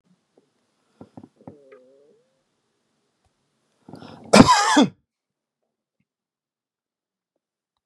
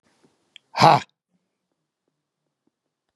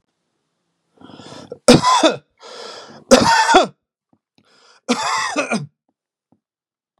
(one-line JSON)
{"cough_length": "7.9 s", "cough_amplitude": 32768, "cough_signal_mean_std_ratio": 0.2, "exhalation_length": "3.2 s", "exhalation_amplitude": 32575, "exhalation_signal_mean_std_ratio": 0.19, "three_cough_length": "7.0 s", "three_cough_amplitude": 32768, "three_cough_signal_mean_std_ratio": 0.37, "survey_phase": "beta (2021-08-13 to 2022-03-07)", "age": "65+", "gender": "Male", "wearing_mask": "No", "symptom_none": true, "smoker_status": "Ex-smoker", "respiratory_condition_asthma": false, "respiratory_condition_other": false, "recruitment_source": "REACT", "submission_delay": "2 days", "covid_test_result": "Negative", "covid_test_method": "RT-qPCR", "influenza_a_test_result": "Negative", "influenza_b_test_result": "Negative"}